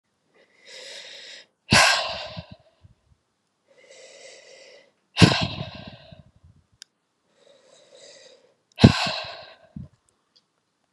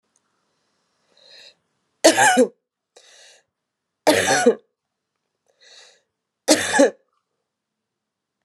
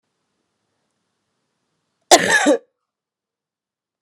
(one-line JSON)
{"exhalation_length": "10.9 s", "exhalation_amplitude": 32767, "exhalation_signal_mean_std_ratio": 0.25, "three_cough_length": "8.4 s", "three_cough_amplitude": 32758, "three_cough_signal_mean_std_ratio": 0.3, "cough_length": "4.0 s", "cough_amplitude": 32768, "cough_signal_mean_std_ratio": 0.24, "survey_phase": "beta (2021-08-13 to 2022-03-07)", "age": "45-64", "gender": "Female", "wearing_mask": "No", "symptom_cough_any": true, "symptom_runny_or_blocked_nose": true, "symptom_sore_throat": true, "symptom_diarrhoea": true, "symptom_fatigue": true, "symptom_headache": true, "symptom_onset": "5 days", "smoker_status": "Never smoked", "respiratory_condition_asthma": false, "respiratory_condition_other": false, "recruitment_source": "Test and Trace", "submission_delay": "4 days", "covid_test_result": "Positive", "covid_test_method": "RT-qPCR", "covid_ct_value": 26.7, "covid_ct_gene": "ORF1ab gene", "covid_ct_mean": 27.1, "covid_viral_load": "1300 copies/ml", "covid_viral_load_category": "Minimal viral load (< 10K copies/ml)"}